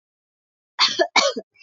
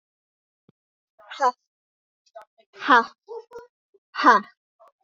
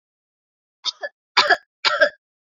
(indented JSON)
{
  "cough_length": "1.6 s",
  "cough_amplitude": 26673,
  "cough_signal_mean_std_ratio": 0.4,
  "exhalation_length": "5.0 s",
  "exhalation_amplitude": 24661,
  "exhalation_signal_mean_std_ratio": 0.25,
  "three_cough_length": "2.5 s",
  "three_cough_amplitude": 31751,
  "three_cough_signal_mean_std_ratio": 0.33,
  "survey_phase": "beta (2021-08-13 to 2022-03-07)",
  "age": "18-44",
  "gender": "Female",
  "wearing_mask": "No",
  "symptom_none": true,
  "smoker_status": "Never smoked",
  "respiratory_condition_asthma": false,
  "respiratory_condition_other": false,
  "recruitment_source": "REACT",
  "submission_delay": "1 day",
  "covid_test_result": "Negative",
  "covid_test_method": "RT-qPCR",
  "influenza_a_test_result": "Negative",
  "influenza_b_test_result": "Negative"
}